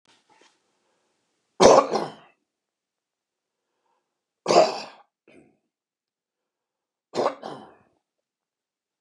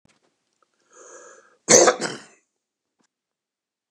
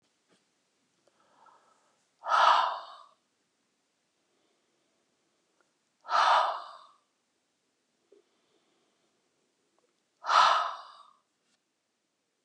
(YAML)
three_cough_length: 9.0 s
three_cough_amplitude: 29204
three_cough_signal_mean_std_ratio: 0.22
cough_length: 3.9 s
cough_amplitude: 29204
cough_signal_mean_std_ratio: 0.22
exhalation_length: 12.4 s
exhalation_amplitude: 11287
exhalation_signal_mean_std_ratio: 0.27
survey_phase: beta (2021-08-13 to 2022-03-07)
age: 65+
gender: Male
wearing_mask: 'No'
symptom_none: true
smoker_status: Ex-smoker
respiratory_condition_asthma: false
respiratory_condition_other: false
recruitment_source: REACT
submission_delay: 2 days
covid_test_result: Negative
covid_test_method: RT-qPCR
influenza_a_test_result: Negative
influenza_b_test_result: Negative